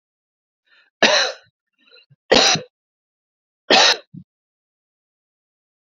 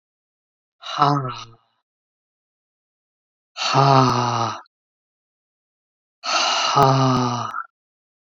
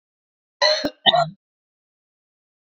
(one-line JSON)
{"three_cough_length": "5.8 s", "three_cough_amplitude": 30869, "three_cough_signal_mean_std_ratio": 0.3, "exhalation_length": "8.3 s", "exhalation_amplitude": 28931, "exhalation_signal_mean_std_ratio": 0.45, "cough_length": "2.6 s", "cough_amplitude": 27344, "cough_signal_mean_std_ratio": 0.32, "survey_phase": "alpha (2021-03-01 to 2021-08-12)", "age": "45-64", "gender": "Female", "wearing_mask": "No", "symptom_none": true, "smoker_status": "Ex-smoker", "respiratory_condition_asthma": false, "respiratory_condition_other": false, "recruitment_source": "REACT", "submission_delay": "1 day", "covid_test_result": "Negative", "covid_test_method": "RT-qPCR"}